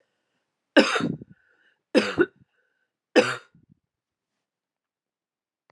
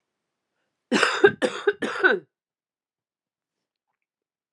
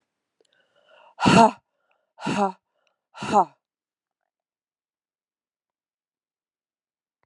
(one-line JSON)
{"three_cough_length": "5.7 s", "three_cough_amplitude": 24943, "three_cough_signal_mean_std_ratio": 0.26, "cough_length": "4.5 s", "cough_amplitude": 27903, "cough_signal_mean_std_ratio": 0.31, "exhalation_length": "7.3 s", "exhalation_amplitude": 27884, "exhalation_signal_mean_std_ratio": 0.22, "survey_phase": "alpha (2021-03-01 to 2021-08-12)", "age": "45-64", "gender": "Female", "wearing_mask": "No", "symptom_cough_any": true, "symptom_fatigue": true, "symptom_fever_high_temperature": true, "symptom_change_to_sense_of_smell_or_taste": true, "symptom_loss_of_taste": true, "symptom_onset": "4 days", "smoker_status": "Never smoked", "respiratory_condition_asthma": false, "respiratory_condition_other": false, "recruitment_source": "Test and Trace", "submission_delay": "2 days", "covid_test_result": "Positive", "covid_test_method": "RT-qPCR", "covid_ct_value": 11.7, "covid_ct_gene": "ORF1ab gene", "covid_ct_mean": 12.1, "covid_viral_load": "110000000 copies/ml", "covid_viral_load_category": "High viral load (>1M copies/ml)"}